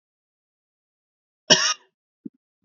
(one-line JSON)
{"cough_length": "2.6 s", "cough_amplitude": 30605, "cough_signal_mean_std_ratio": 0.21, "survey_phase": "beta (2021-08-13 to 2022-03-07)", "age": "65+", "gender": "Male", "wearing_mask": "No", "symptom_fatigue": true, "symptom_onset": "11 days", "smoker_status": "Ex-smoker", "respiratory_condition_asthma": true, "respiratory_condition_other": false, "recruitment_source": "REACT", "submission_delay": "3 days", "covid_test_result": "Negative", "covid_test_method": "RT-qPCR", "influenza_a_test_result": "Negative", "influenza_b_test_result": "Negative"}